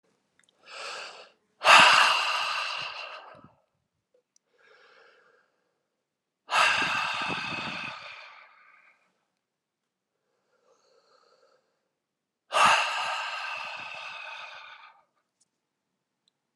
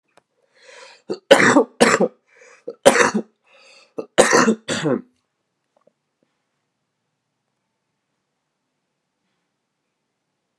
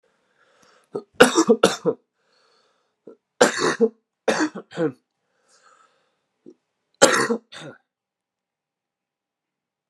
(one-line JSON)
{"exhalation_length": "16.6 s", "exhalation_amplitude": 24279, "exhalation_signal_mean_std_ratio": 0.34, "cough_length": "10.6 s", "cough_amplitude": 32768, "cough_signal_mean_std_ratio": 0.29, "three_cough_length": "9.9 s", "three_cough_amplitude": 32768, "three_cough_signal_mean_std_ratio": 0.29, "survey_phase": "alpha (2021-03-01 to 2021-08-12)", "age": "18-44", "gender": "Male", "wearing_mask": "No", "symptom_cough_any": true, "symptom_fatigue": true, "symptom_headache": true, "symptom_change_to_sense_of_smell_or_taste": true, "symptom_loss_of_taste": true, "symptom_onset": "7 days", "smoker_status": "Never smoked", "respiratory_condition_asthma": false, "respiratory_condition_other": false, "recruitment_source": "Test and Trace", "submission_delay": "1 day", "covid_test_result": "Positive", "covid_test_method": "RT-qPCR"}